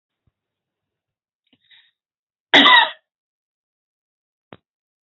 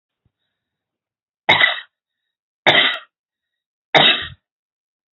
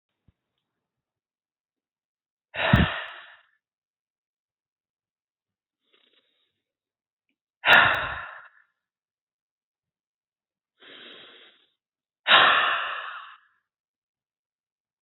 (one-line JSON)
{"cough_length": "5.0 s", "cough_amplitude": 30188, "cough_signal_mean_std_ratio": 0.21, "three_cough_length": "5.1 s", "three_cough_amplitude": 29296, "three_cough_signal_mean_std_ratio": 0.31, "exhalation_length": "15.0 s", "exhalation_amplitude": 25360, "exhalation_signal_mean_std_ratio": 0.24, "survey_phase": "alpha (2021-03-01 to 2021-08-12)", "age": "65+", "gender": "Female", "wearing_mask": "No", "symptom_none": true, "smoker_status": "Never smoked", "respiratory_condition_asthma": false, "respiratory_condition_other": false, "recruitment_source": "REACT", "submission_delay": "3 days", "covid_test_result": "Negative", "covid_test_method": "RT-qPCR"}